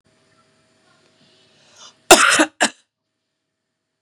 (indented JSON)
{
  "cough_length": "4.0 s",
  "cough_amplitude": 32768,
  "cough_signal_mean_std_ratio": 0.24,
  "survey_phase": "beta (2021-08-13 to 2022-03-07)",
  "age": "45-64",
  "gender": "Female",
  "wearing_mask": "No",
  "symptom_fatigue": true,
  "symptom_headache": true,
  "symptom_other": true,
  "smoker_status": "Ex-smoker",
  "respiratory_condition_asthma": false,
  "respiratory_condition_other": false,
  "recruitment_source": "Test and Trace",
  "submission_delay": "1 day",
  "covid_test_result": "Positive",
  "covid_test_method": "RT-qPCR",
  "covid_ct_value": 16.3,
  "covid_ct_gene": "ORF1ab gene"
}